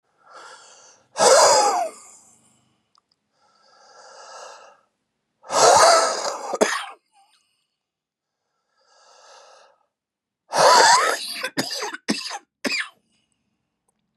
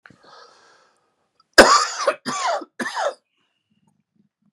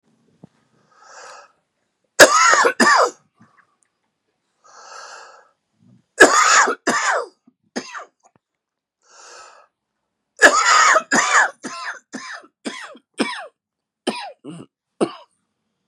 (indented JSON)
{
  "exhalation_length": "14.2 s",
  "exhalation_amplitude": 30792,
  "exhalation_signal_mean_std_ratio": 0.37,
  "cough_length": "4.5 s",
  "cough_amplitude": 32768,
  "cough_signal_mean_std_ratio": 0.31,
  "three_cough_length": "15.9 s",
  "three_cough_amplitude": 32768,
  "three_cough_signal_mean_std_ratio": 0.36,
  "survey_phase": "beta (2021-08-13 to 2022-03-07)",
  "age": "45-64",
  "gender": "Male",
  "wearing_mask": "No",
  "symptom_cough_any": true,
  "symptom_runny_or_blocked_nose": true,
  "symptom_shortness_of_breath": true,
  "symptom_sore_throat": true,
  "symptom_fatigue": true,
  "symptom_fever_high_temperature": true,
  "symptom_headache": true,
  "symptom_onset": "6 days",
  "smoker_status": "Never smoked",
  "respiratory_condition_asthma": false,
  "respiratory_condition_other": false,
  "recruitment_source": "Test and Trace",
  "submission_delay": "1 day",
  "covid_test_result": "Positive",
  "covid_test_method": "RT-qPCR",
  "covid_ct_value": 19.3,
  "covid_ct_gene": "ORF1ab gene",
  "covid_ct_mean": 19.7,
  "covid_viral_load": "350000 copies/ml",
  "covid_viral_load_category": "Low viral load (10K-1M copies/ml)"
}